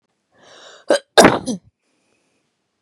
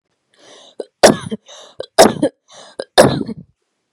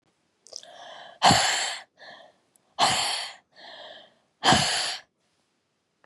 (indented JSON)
{
  "cough_length": "2.8 s",
  "cough_amplitude": 32768,
  "cough_signal_mean_std_ratio": 0.26,
  "three_cough_length": "3.9 s",
  "three_cough_amplitude": 32768,
  "three_cough_signal_mean_std_ratio": 0.32,
  "exhalation_length": "6.1 s",
  "exhalation_amplitude": 19072,
  "exhalation_signal_mean_std_ratio": 0.41,
  "survey_phase": "beta (2021-08-13 to 2022-03-07)",
  "age": "18-44",
  "gender": "Female",
  "wearing_mask": "No",
  "symptom_none": true,
  "smoker_status": "Never smoked",
  "respiratory_condition_asthma": false,
  "respiratory_condition_other": false,
  "recruitment_source": "REACT",
  "submission_delay": "2 days",
  "covid_test_result": "Negative",
  "covid_test_method": "RT-qPCR",
  "influenza_a_test_result": "Negative",
  "influenza_b_test_result": "Negative"
}